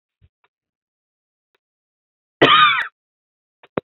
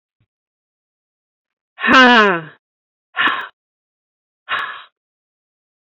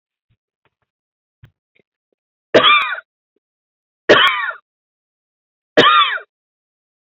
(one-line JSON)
{"cough_length": "3.9 s", "cough_amplitude": 29796, "cough_signal_mean_std_ratio": 0.26, "exhalation_length": "5.8 s", "exhalation_amplitude": 28644, "exhalation_signal_mean_std_ratio": 0.31, "three_cough_length": "7.1 s", "three_cough_amplitude": 29953, "three_cough_signal_mean_std_ratio": 0.32, "survey_phase": "alpha (2021-03-01 to 2021-08-12)", "age": "45-64", "gender": "Female", "wearing_mask": "No", "symptom_none": true, "smoker_status": "Never smoked", "respiratory_condition_asthma": false, "respiratory_condition_other": false, "recruitment_source": "REACT", "submission_delay": "1 day", "covid_test_result": "Negative", "covid_test_method": "RT-qPCR"}